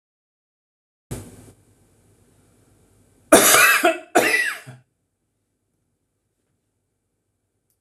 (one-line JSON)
{"cough_length": "7.8 s", "cough_amplitude": 26028, "cough_signal_mean_std_ratio": 0.29, "survey_phase": "beta (2021-08-13 to 2022-03-07)", "age": "65+", "gender": "Male", "wearing_mask": "No", "symptom_none": true, "smoker_status": "Ex-smoker", "respiratory_condition_asthma": false, "respiratory_condition_other": false, "recruitment_source": "REACT", "submission_delay": "3 days", "covid_test_result": "Negative", "covid_test_method": "RT-qPCR"}